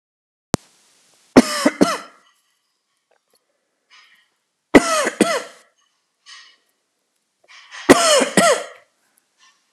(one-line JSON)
{"three_cough_length": "9.7 s", "three_cough_amplitude": 32768, "three_cough_signal_mean_std_ratio": 0.29, "survey_phase": "alpha (2021-03-01 to 2021-08-12)", "age": "18-44", "gender": "Male", "wearing_mask": "No", "symptom_cough_any": true, "symptom_fatigue": true, "smoker_status": "Never smoked", "respiratory_condition_asthma": false, "respiratory_condition_other": false, "recruitment_source": "REACT", "submission_delay": "1 day", "covid_test_result": "Negative", "covid_test_method": "RT-qPCR"}